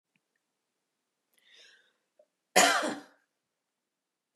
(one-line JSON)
{"cough_length": "4.4 s", "cough_amplitude": 14063, "cough_signal_mean_std_ratio": 0.22, "survey_phase": "beta (2021-08-13 to 2022-03-07)", "age": "65+", "gender": "Female", "wearing_mask": "No", "symptom_none": true, "smoker_status": "Ex-smoker", "respiratory_condition_asthma": false, "respiratory_condition_other": false, "recruitment_source": "REACT", "submission_delay": "2 days", "covid_test_result": "Negative", "covid_test_method": "RT-qPCR", "influenza_a_test_result": "Negative", "influenza_b_test_result": "Negative"}